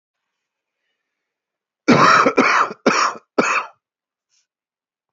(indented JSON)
{
  "cough_length": "5.1 s",
  "cough_amplitude": 27874,
  "cough_signal_mean_std_ratio": 0.4,
  "survey_phase": "beta (2021-08-13 to 2022-03-07)",
  "age": "45-64",
  "gender": "Female",
  "wearing_mask": "No",
  "symptom_cough_any": true,
  "symptom_runny_or_blocked_nose": true,
  "symptom_shortness_of_breath": true,
  "symptom_sore_throat": true,
  "symptom_fatigue": true,
  "symptom_fever_high_temperature": true,
  "symptom_headache": true,
  "symptom_change_to_sense_of_smell_or_taste": true,
  "symptom_loss_of_taste": true,
  "smoker_status": "Current smoker (e-cigarettes or vapes only)",
  "respiratory_condition_asthma": false,
  "respiratory_condition_other": true,
  "recruitment_source": "Test and Trace",
  "submission_delay": "2 days",
  "covid_test_result": "Positive",
  "covid_test_method": "RT-qPCR",
  "covid_ct_value": 32.7,
  "covid_ct_gene": "ORF1ab gene"
}